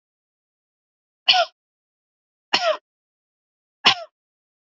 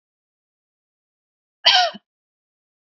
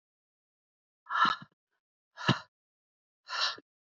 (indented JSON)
{
  "three_cough_length": "4.6 s",
  "three_cough_amplitude": 29657,
  "three_cough_signal_mean_std_ratio": 0.24,
  "cough_length": "2.8 s",
  "cough_amplitude": 32768,
  "cough_signal_mean_std_ratio": 0.23,
  "exhalation_length": "3.9 s",
  "exhalation_amplitude": 7425,
  "exhalation_signal_mean_std_ratio": 0.3,
  "survey_phase": "beta (2021-08-13 to 2022-03-07)",
  "age": "18-44",
  "gender": "Female",
  "wearing_mask": "No",
  "symptom_none": true,
  "symptom_onset": "12 days",
  "smoker_status": "Never smoked",
  "respiratory_condition_asthma": false,
  "respiratory_condition_other": false,
  "recruitment_source": "REACT",
  "submission_delay": "7 days",
  "covid_test_result": "Negative",
  "covid_test_method": "RT-qPCR",
  "influenza_a_test_result": "Negative",
  "influenza_b_test_result": "Negative"
}